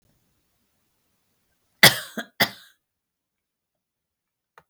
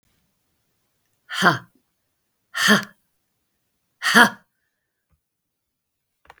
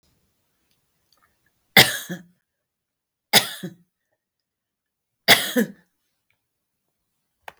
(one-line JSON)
{"cough_length": "4.7 s", "cough_amplitude": 32768, "cough_signal_mean_std_ratio": 0.15, "exhalation_length": "6.4 s", "exhalation_amplitude": 32767, "exhalation_signal_mean_std_ratio": 0.25, "three_cough_length": "7.6 s", "three_cough_amplitude": 32768, "three_cough_signal_mean_std_ratio": 0.21, "survey_phase": "beta (2021-08-13 to 2022-03-07)", "age": "45-64", "gender": "Female", "wearing_mask": "No", "symptom_runny_or_blocked_nose": true, "symptom_sore_throat": true, "symptom_onset": "4 days", "smoker_status": "Never smoked", "respiratory_condition_asthma": true, "respiratory_condition_other": false, "recruitment_source": "Test and Trace", "submission_delay": "2 days", "covid_test_result": "Positive", "covid_test_method": "RT-qPCR", "covid_ct_value": 29.5, "covid_ct_gene": "ORF1ab gene", "covid_ct_mean": 30.1, "covid_viral_load": "140 copies/ml", "covid_viral_load_category": "Minimal viral load (< 10K copies/ml)"}